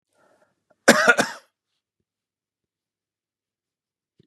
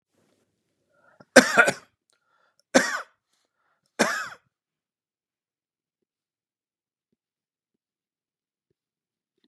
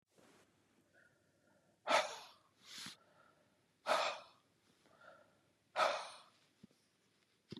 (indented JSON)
{
  "cough_length": "4.3 s",
  "cough_amplitude": 32767,
  "cough_signal_mean_std_ratio": 0.2,
  "three_cough_length": "9.5 s",
  "three_cough_amplitude": 32767,
  "three_cough_signal_mean_std_ratio": 0.18,
  "exhalation_length": "7.6 s",
  "exhalation_amplitude": 3094,
  "exhalation_signal_mean_std_ratio": 0.3,
  "survey_phase": "beta (2021-08-13 to 2022-03-07)",
  "age": "45-64",
  "gender": "Male",
  "wearing_mask": "No",
  "symptom_none": true,
  "smoker_status": "Never smoked",
  "respiratory_condition_asthma": false,
  "respiratory_condition_other": false,
  "recruitment_source": "REACT",
  "submission_delay": "2 days",
  "covid_test_result": "Negative",
  "covid_test_method": "RT-qPCR",
  "influenza_a_test_result": "Negative",
  "influenza_b_test_result": "Negative"
}